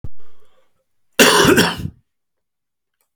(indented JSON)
{
  "cough_length": "3.2 s",
  "cough_amplitude": 32767,
  "cough_signal_mean_std_ratio": 0.44,
  "survey_phase": "alpha (2021-03-01 to 2021-08-12)",
  "age": "45-64",
  "gender": "Male",
  "wearing_mask": "No",
  "symptom_none": true,
  "smoker_status": "Current smoker (11 or more cigarettes per day)",
  "respiratory_condition_asthma": false,
  "respiratory_condition_other": false,
  "recruitment_source": "REACT",
  "submission_delay": "3 days",
  "covid_test_result": "Negative",
  "covid_test_method": "RT-qPCR"
}